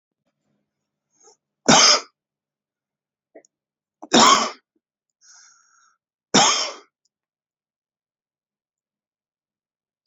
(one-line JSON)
{"three_cough_length": "10.1 s", "three_cough_amplitude": 30385, "three_cough_signal_mean_std_ratio": 0.25, "survey_phase": "beta (2021-08-13 to 2022-03-07)", "age": "45-64", "gender": "Male", "wearing_mask": "No", "symptom_none": true, "symptom_onset": "5 days", "smoker_status": "Ex-smoker", "respiratory_condition_asthma": false, "respiratory_condition_other": false, "recruitment_source": "REACT", "submission_delay": "1 day", "covid_test_result": "Negative", "covid_test_method": "RT-qPCR", "influenza_a_test_result": "Negative", "influenza_b_test_result": "Negative"}